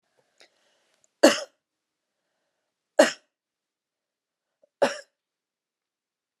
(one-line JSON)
{"three_cough_length": "6.4 s", "three_cough_amplitude": 26299, "three_cough_signal_mean_std_ratio": 0.17, "survey_phase": "beta (2021-08-13 to 2022-03-07)", "age": "45-64", "gender": "Female", "wearing_mask": "No", "symptom_cough_any": true, "symptom_runny_or_blocked_nose": true, "symptom_onset": "3 days", "smoker_status": "Never smoked", "respiratory_condition_asthma": false, "respiratory_condition_other": false, "recruitment_source": "REACT", "submission_delay": "2 days", "covid_test_result": "Negative", "covid_test_method": "RT-qPCR"}